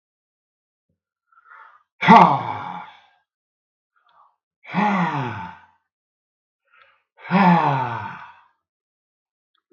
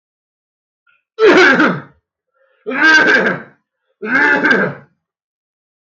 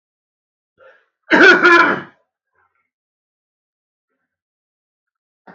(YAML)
exhalation_length: 9.7 s
exhalation_amplitude: 32767
exhalation_signal_mean_std_ratio: 0.32
three_cough_length: 5.9 s
three_cough_amplitude: 32767
three_cough_signal_mean_std_ratio: 0.51
cough_length: 5.5 s
cough_amplitude: 32767
cough_signal_mean_std_ratio: 0.28
survey_phase: beta (2021-08-13 to 2022-03-07)
age: 45-64
gender: Male
wearing_mask: 'No'
symptom_none: true
symptom_onset: 2 days
smoker_status: Current smoker (1 to 10 cigarettes per day)
respiratory_condition_asthma: false
respiratory_condition_other: false
recruitment_source: REACT
submission_delay: 5 days
covid_test_result: Negative
covid_test_method: RT-qPCR
influenza_a_test_result: Negative
influenza_b_test_result: Negative